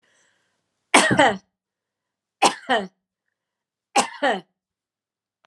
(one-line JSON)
{"three_cough_length": "5.5 s", "three_cough_amplitude": 32767, "three_cough_signal_mean_std_ratio": 0.31, "survey_phase": "alpha (2021-03-01 to 2021-08-12)", "age": "45-64", "gender": "Female", "wearing_mask": "No", "symptom_none": true, "smoker_status": "Never smoked", "respiratory_condition_asthma": false, "respiratory_condition_other": false, "recruitment_source": "REACT", "submission_delay": "1 day", "covid_test_result": "Negative", "covid_test_method": "RT-qPCR"}